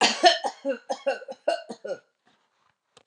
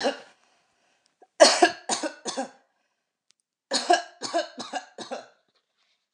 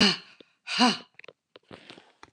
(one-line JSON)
{"cough_length": "3.1 s", "cough_amplitude": 25944, "cough_signal_mean_std_ratio": 0.4, "three_cough_length": "6.1 s", "three_cough_amplitude": 27196, "three_cough_signal_mean_std_ratio": 0.31, "exhalation_length": "2.3 s", "exhalation_amplitude": 13340, "exhalation_signal_mean_std_ratio": 0.34, "survey_phase": "beta (2021-08-13 to 2022-03-07)", "age": "65+", "gender": "Female", "wearing_mask": "No", "symptom_none": true, "smoker_status": "Never smoked", "respiratory_condition_asthma": false, "respiratory_condition_other": false, "recruitment_source": "REACT", "submission_delay": "1 day", "covid_test_result": "Negative", "covid_test_method": "RT-qPCR", "influenza_a_test_result": "Negative", "influenza_b_test_result": "Negative"}